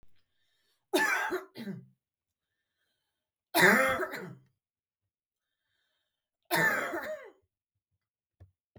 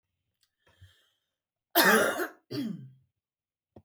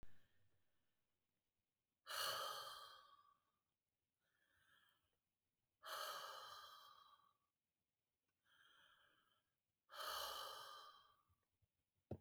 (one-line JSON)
{"three_cough_length": "8.8 s", "three_cough_amplitude": 11404, "three_cough_signal_mean_std_ratio": 0.34, "cough_length": "3.8 s", "cough_amplitude": 16670, "cough_signal_mean_std_ratio": 0.33, "exhalation_length": "12.2 s", "exhalation_amplitude": 662, "exhalation_signal_mean_std_ratio": 0.42, "survey_phase": "beta (2021-08-13 to 2022-03-07)", "age": "45-64", "gender": "Female", "wearing_mask": "No", "symptom_none": true, "smoker_status": "Never smoked", "respiratory_condition_asthma": false, "respiratory_condition_other": false, "recruitment_source": "REACT", "submission_delay": "1 day", "covid_test_result": "Negative", "covid_test_method": "RT-qPCR", "influenza_a_test_result": "Negative", "influenza_b_test_result": "Negative"}